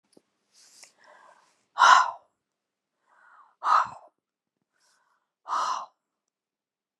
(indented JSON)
{
  "exhalation_length": "7.0 s",
  "exhalation_amplitude": 28112,
  "exhalation_signal_mean_std_ratio": 0.25,
  "survey_phase": "beta (2021-08-13 to 2022-03-07)",
  "age": "45-64",
  "gender": "Female",
  "wearing_mask": "No",
  "symptom_none": true,
  "smoker_status": "Current smoker (e-cigarettes or vapes only)",
  "respiratory_condition_asthma": false,
  "respiratory_condition_other": false,
  "recruitment_source": "REACT",
  "submission_delay": "2 days",
  "covid_test_result": "Negative",
  "covid_test_method": "RT-qPCR"
}